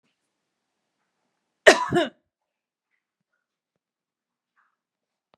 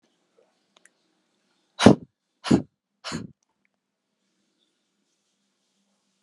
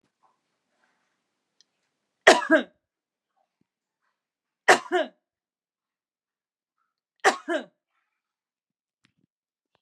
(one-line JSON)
{"cough_length": "5.4 s", "cough_amplitude": 32767, "cough_signal_mean_std_ratio": 0.16, "exhalation_length": "6.2 s", "exhalation_amplitude": 32768, "exhalation_signal_mean_std_ratio": 0.15, "three_cough_length": "9.8 s", "three_cough_amplitude": 32339, "three_cough_signal_mean_std_ratio": 0.19, "survey_phase": "beta (2021-08-13 to 2022-03-07)", "age": "18-44", "gender": "Female", "wearing_mask": "No", "symptom_none": true, "smoker_status": "Never smoked", "respiratory_condition_asthma": false, "respiratory_condition_other": false, "recruitment_source": "REACT", "submission_delay": "2 days", "covid_test_result": "Negative", "covid_test_method": "RT-qPCR"}